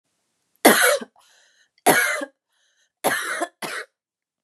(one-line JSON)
{"three_cough_length": "4.4 s", "three_cough_amplitude": 32765, "three_cough_signal_mean_std_ratio": 0.38, "survey_phase": "beta (2021-08-13 to 2022-03-07)", "age": "18-44", "gender": "Female", "wearing_mask": "No", "symptom_cough_any": true, "symptom_runny_or_blocked_nose": true, "symptom_sore_throat": true, "symptom_fatigue": true, "symptom_headache": true, "smoker_status": "Never smoked", "respiratory_condition_asthma": true, "respiratory_condition_other": false, "recruitment_source": "Test and Trace", "submission_delay": "2 days", "covid_test_result": "Positive", "covid_test_method": "RT-qPCR", "covid_ct_value": 31.0, "covid_ct_gene": "ORF1ab gene"}